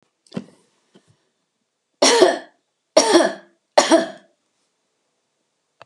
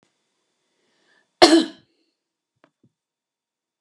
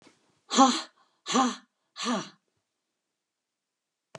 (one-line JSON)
{"three_cough_length": "5.9 s", "three_cough_amplitude": 32767, "three_cough_signal_mean_std_ratio": 0.32, "cough_length": "3.8 s", "cough_amplitude": 32768, "cough_signal_mean_std_ratio": 0.19, "exhalation_length": "4.2 s", "exhalation_amplitude": 19218, "exhalation_signal_mean_std_ratio": 0.31, "survey_phase": "beta (2021-08-13 to 2022-03-07)", "age": "65+", "gender": "Female", "wearing_mask": "No", "symptom_none": true, "smoker_status": "Never smoked", "respiratory_condition_asthma": false, "respiratory_condition_other": false, "recruitment_source": "REACT", "submission_delay": "1 day", "covid_test_result": "Negative", "covid_test_method": "RT-qPCR", "influenza_a_test_result": "Negative", "influenza_b_test_result": "Negative"}